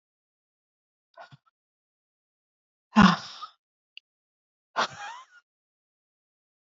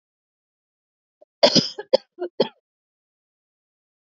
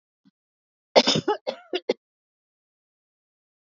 {
  "exhalation_length": "6.7 s",
  "exhalation_amplitude": 21958,
  "exhalation_signal_mean_std_ratio": 0.17,
  "three_cough_length": "4.1 s",
  "three_cough_amplitude": 29146,
  "three_cough_signal_mean_std_ratio": 0.21,
  "cough_length": "3.7 s",
  "cough_amplitude": 27944,
  "cough_signal_mean_std_ratio": 0.24,
  "survey_phase": "beta (2021-08-13 to 2022-03-07)",
  "age": "45-64",
  "gender": "Female",
  "wearing_mask": "Yes",
  "symptom_headache": true,
  "symptom_onset": "2 days",
  "smoker_status": "Ex-smoker",
  "respiratory_condition_asthma": false,
  "respiratory_condition_other": false,
  "recruitment_source": "Test and Trace",
  "submission_delay": "1 day",
  "covid_test_result": "Negative",
  "covid_test_method": "RT-qPCR"
}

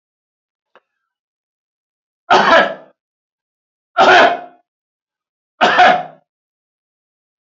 {
  "three_cough_length": "7.4 s",
  "three_cough_amplitude": 29101,
  "three_cough_signal_mean_std_ratio": 0.33,
  "survey_phase": "beta (2021-08-13 to 2022-03-07)",
  "age": "65+",
  "gender": "Male",
  "wearing_mask": "No",
  "symptom_none": true,
  "smoker_status": "Never smoked",
  "respiratory_condition_asthma": false,
  "respiratory_condition_other": false,
  "recruitment_source": "Test and Trace",
  "submission_delay": "1 day",
  "covid_test_result": "Positive",
  "covid_test_method": "RT-qPCR",
  "covid_ct_value": 36.2,
  "covid_ct_gene": "ORF1ab gene"
}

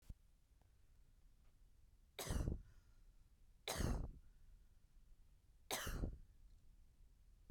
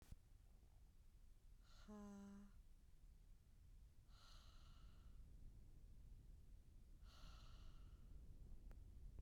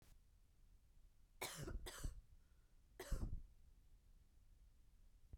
{
  "three_cough_length": "7.5 s",
  "three_cough_amplitude": 1491,
  "three_cough_signal_mean_std_ratio": 0.45,
  "exhalation_length": "9.2 s",
  "exhalation_amplitude": 187,
  "exhalation_signal_mean_std_ratio": 1.14,
  "cough_length": "5.4 s",
  "cough_amplitude": 762,
  "cough_signal_mean_std_ratio": 0.5,
  "survey_phase": "beta (2021-08-13 to 2022-03-07)",
  "age": "18-44",
  "gender": "Female",
  "wearing_mask": "No",
  "symptom_none": true,
  "smoker_status": "Current smoker (1 to 10 cigarettes per day)",
  "respiratory_condition_asthma": false,
  "respiratory_condition_other": false,
  "recruitment_source": "REACT",
  "submission_delay": "1 day",
  "covid_test_result": "Negative",
  "covid_test_method": "RT-qPCR"
}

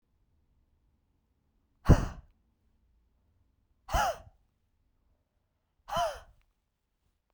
{
  "exhalation_length": "7.3 s",
  "exhalation_amplitude": 17390,
  "exhalation_signal_mean_std_ratio": 0.2,
  "survey_phase": "beta (2021-08-13 to 2022-03-07)",
  "age": "18-44",
  "gender": "Female",
  "wearing_mask": "No",
  "symptom_cough_any": true,
  "symptom_runny_or_blocked_nose": true,
  "symptom_shortness_of_breath": true,
  "symptom_fatigue": true,
  "symptom_headache": true,
  "symptom_change_to_sense_of_smell_or_taste": true,
  "symptom_loss_of_taste": true,
  "symptom_other": true,
  "symptom_onset": "3 days",
  "smoker_status": "Never smoked",
  "respiratory_condition_asthma": true,
  "respiratory_condition_other": false,
  "recruitment_source": "Test and Trace",
  "submission_delay": "2 days",
  "covid_test_result": "Positive",
  "covid_test_method": "RT-qPCR",
  "covid_ct_value": 18.8,
  "covid_ct_gene": "ORF1ab gene",
  "covid_ct_mean": 19.4,
  "covid_viral_load": "430000 copies/ml",
  "covid_viral_load_category": "Low viral load (10K-1M copies/ml)"
}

